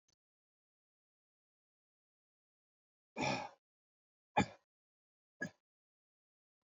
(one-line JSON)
{"exhalation_length": "6.7 s", "exhalation_amplitude": 3718, "exhalation_signal_mean_std_ratio": 0.18, "survey_phase": "beta (2021-08-13 to 2022-03-07)", "age": "65+", "gender": "Male", "wearing_mask": "No", "symptom_none": true, "smoker_status": "Ex-smoker", "respiratory_condition_asthma": false, "respiratory_condition_other": false, "recruitment_source": "REACT", "submission_delay": "2 days", "covid_test_result": "Negative", "covid_test_method": "RT-qPCR"}